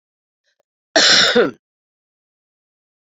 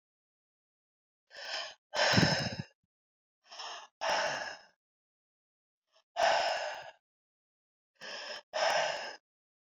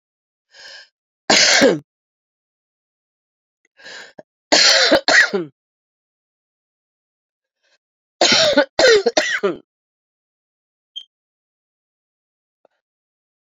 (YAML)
cough_length: 3.1 s
cough_amplitude: 32768
cough_signal_mean_std_ratio: 0.34
exhalation_length: 9.7 s
exhalation_amplitude: 7607
exhalation_signal_mean_std_ratio: 0.42
three_cough_length: 13.6 s
three_cough_amplitude: 32413
three_cough_signal_mean_std_ratio: 0.33
survey_phase: beta (2021-08-13 to 2022-03-07)
age: 45-64
gender: Female
wearing_mask: 'No'
symptom_cough_any: true
symptom_new_continuous_cough: true
symptom_runny_or_blocked_nose: true
symptom_sore_throat: true
symptom_diarrhoea: true
symptom_headache: true
symptom_onset: 5 days
smoker_status: Never smoked
respiratory_condition_asthma: false
respiratory_condition_other: false
recruitment_source: Test and Trace
submission_delay: 2 days
covid_test_result: Positive
covid_test_method: RT-qPCR
covid_ct_value: 19.3
covid_ct_gene: ORF1ab gene
covid_ct_mean: 19.9
covid_viral_load: 300000 copies/ml
covid_viral_load_category: Low viral load (10K-1M copies/ml)